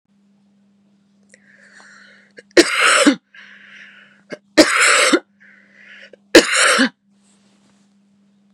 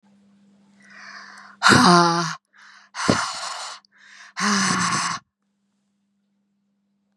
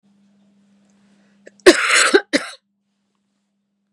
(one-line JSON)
{"three_cough_length": "8.5 s", "three_cough_amplitude": 32768, "three_cough_signal_mean_std_ratio": 0.35, "exhalation_length": "7.2 s", "exhalation_amplitude": 30932, "exhalation_signal_mean_std_ratio": 0.4, "cough_length": "3.9 s", "cough_amplitude": 32768, "cough_signal_mean_std_ratio": 0.28, "survey_phase": "beta (2021-08-13 to 2022-03-07)", "age": "45-64", "gender": "Female", "wearing_mask": "No", "symptom_none": true, "symptom_onset": "12 days", "smoker_status": "Never smoked", "respiratory_condition_asthma": false, "respiratory_condition_other": false, "recruitment_source": "REACT", "submission_delay": "1 day", "covid_test_result": "Negative", "covid_test_method": "RT-qPCR", "influenza_a_test_result": "Negative", "influenza_b_test_result": "Negative"}